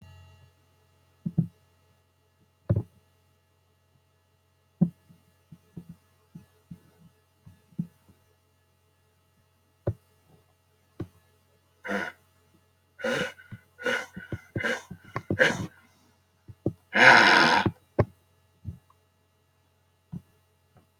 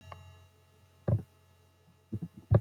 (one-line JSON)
{"exhalation_length": "21.0 s", "exhalation_amplitude": 26719, "exhalation_signal_mean_std_ratio": 0.26, "three_cough_length": "2.6 s", "three_cough_amplitude": 7554, "three_cough_signal_mean_std_ratio": 0.29, "survey_phase": "beta (2021-08-13 to 2022-03-07)", "age": "65+", "gender": "Male", "wearing_mask": "No", "symptom_none": true, "smoker_status": "Ex-smoker", "respiratory_condition_asthma": false, "respiratory_condition_other": true, "recruitment_source": "REACT", "submission_delay": "2 days", "covid_test_result": "Negative", "covid_test_method": "RT-qPCR"}